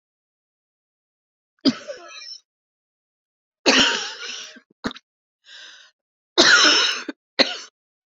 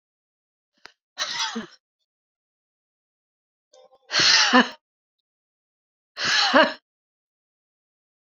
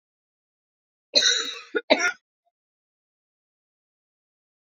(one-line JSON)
{"three_cough_length": "8.2 s", "three_cough_amplitude": 30102, "three_cough_signal_mean_std_ratio": 0.33, "exhalation_length": "8.3 s", "exhalation_amplitude": 27357, "exhalation_signal_mean_std_ratio": 0.3, "cough_length": "4.7 s", "cough_amplitude": 23846, "cough_signal_mean_std_ratio": 0.27, "survey_phase": "beta (2021-08-13 to 2022-03-07)", "age": "45-64", "gender": "Female", "wearing_mask": "No", "symptom_cough_any": true, "symptom_new_continuous_cough": true, "symptom_shortness_of_breath": true, "symptom_diarrhoea": true, "symptom_fatigue": true, "symptom_headache": true, "smoker_status": "Ex-smoker", "respiratory_condition_asthma": false, "respiratory_condition_other": true, "recruitment_source": "Test and Trace", "submission_delay": "2 days", "covid_test_result": "Negative", "covid_test_method": "ePCR"}